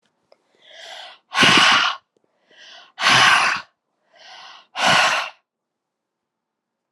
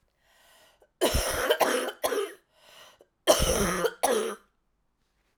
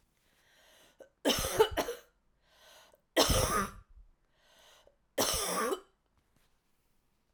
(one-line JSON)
{"exhalation_length": "6.9 s", "exhalation_amplitude": 29810, "exhalation_signal_mean_std_ratio": 0.42, "cough_length": "5.4 s", "cough_amplitude": 16546, "cough_signal_mean_std_ratio": 0.51, "three_cough_length": "7.3 s", "three_cough_amplitude": 8733, "three_cough_signal_mean_std_ratio": 0.39, "survey_phase": "alpha (2021-03-01 to 2021-08-12)", "age": "45-64", "gender": "Female", "wearing_mask": "No", "symptom_cough_any": true, "symptom_fatigue": true, "symptom_onset": "3 days", "smoker_status": "Never smoked", "respiratory_condition_asthma": false, "respiratory_condition_other": false, "recruitment_source": "Test and Trace", "submission_delay": "1 day", "covid_test_result": "Positive", "covid_test_method": "RT-qPCR", "covid_ct_value": 16.1, "covid_ct_gene": "ORF1ab gene", "covid_ct_mean": 16.5, "covid_viral_load": "3700000 copies/ml", "covid_viral_load_category": "High viral load (>1M copies/ml)"}